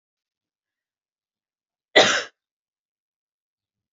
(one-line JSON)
{"cough_length": "3.9 s", "cough_amplitude": 28024, "cough_signal_mean_std_ratio": 0.18, "survey_phase": "alpha (2021-03-01 to 2021-08-12)", "age": "45-64", "gender": "Female", "wearing_mask": "No", "symptom_none": true, "smoker_status": "Never smoked", "respiratory_condition_asthma": false, "respiratory_condition_other": false, "recruitment_source": "REACT", "submission_delay": "7 days", "covid_test_result": "Negative", "covid_test_method": "RT-qPCR"}